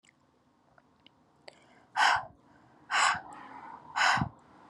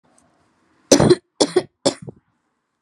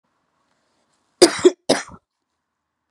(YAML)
exhalation_length: 4.7 s
exhalation_amplitude: 8332
exhalation_signal_mean_std_ratio: 0.38
three_cough_length: 2.8 s
three_cough_amplitude: 32768
three_cough_signal_mean_std_ratio: 0.3
cough_length: 2.9 s
cough_amplitude: 32768
cough_signal_mean_std_ratio: 0.22
survey_phase: beta (2021-08-13 to 2022-03-07)
age: 18-44
gender: Female
wearing_mask: 'No'
symptom_cough_any: true
symptom_new_continuous_cough: true
symptom_runny_or_blocked_nose: true
symptom_sore_throat: true
symptom_abdominal_pain: true
symptom_diarrhoea: true
symptom_fatigue: true
symptom_fever_high_temperature: true
symptom_headache: true
symptom_change_to_sense_of_smell_or_taste: true
symptom_loss_of_taste: true
symptom_onset: 4 days
smoker_status: Never smoked
respiratory_condition_asthma: false
respiratory_condition_other: false
recruitment_source: Test and Trace
submission_delay: 2 days
covid_test_result: Positive
covid_test_method: RT-qPCR
covid_ct_value: 15.7
covid_ct_gene: ORF1ab gene
covid_ct_mean: 16.2
covid_viral_load: 4800000 copies/ml
covid_viral_load_category: High viral load (>1M copies/ml)